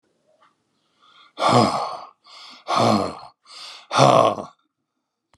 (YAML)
exhalation_length: 5.4 s
exhalation_amplitude: 32124
exhalation_signal_mean_std_ratio: 0.41
survey_phase: alpha (2021-03-01 to 2021-08-12)
age: 65+
gender: Male
wearing_mask: 'No'
symptom_none: true
smoker_status: Ex-smoker
respiratory_condition_asthma: false
respiratory_condition_other: false
recruitment_source: REACT
submission_delay: 2 days
covid_test_result: Negative
covid_test_method: RT-qPCR